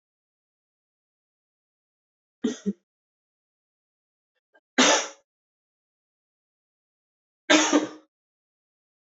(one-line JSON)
{"three_cough_length": "9.0 s", "three_cough_amplitude": 20189, "three_cough_signal_mean_std_ratio": 0.22, "survey_phase": "beta (2021-08-13 to 2022-03-07)", "age": "18-44", "gender": "Male", "wearing_mask": "No", "symptom_cough_any": true, "symptom_new_continuous_cough": true, "symptom_runny_or_blocked_nose": true, "symptom_sore_throat": true, "symptom_fatigue": true, "symptom_fever_high_temperature": true, "symptom_headache": true, "symptom_change_to_sense_of_smell_or_taste": true, "symptom_loss_of_taste": true, "symptom_onset": "4 days", "smoker_status": "Ex-smoker", "respiratory_condition_asthma": false, "respiratory_condition_other": false, "recruitment_source": "Test and Trace", "submission_delay": "1 day", "covid_test_result": "Positive", "covid_test_method": "RT-qPCR"}